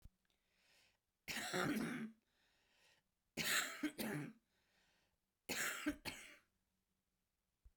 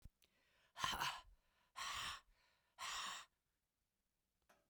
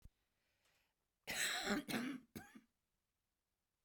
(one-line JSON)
{"three_cough_length": "7.8 s", "three_cough_amplitude": 2070, "three_cough_signal_mean_std_ratio": 0.44, "exhalation_length": "4.7 s", "exhalation_amplitude": 1730, "exhalation_signal_mean_std_ratio": 0.44, "cough_length": "3.8 s", "cough_amplitude": 1808, "cough_signal_mean_std_ratio": 0.41, "survey_phase": "beta (2021-08-13 to 2022-03-07)", "age": "65+", "gender": "Female", "wearing_mask": "No", "symptom_cough_any": true, "symptom_abdominal_pain": true, "symptom_onset": "12 days", "smoker_status": "Ex-smoker", "respiratory_condition_asthma": true, "respiratory_condition_other": false, "recruitment_source": "REACT", "submission_delay": "2 days", "covid_test_result": "Negative", "covid_test_method": "RT-qPCR", "influenza_a_test_result": "Negative", "influenza_b_test_result": "Negative"}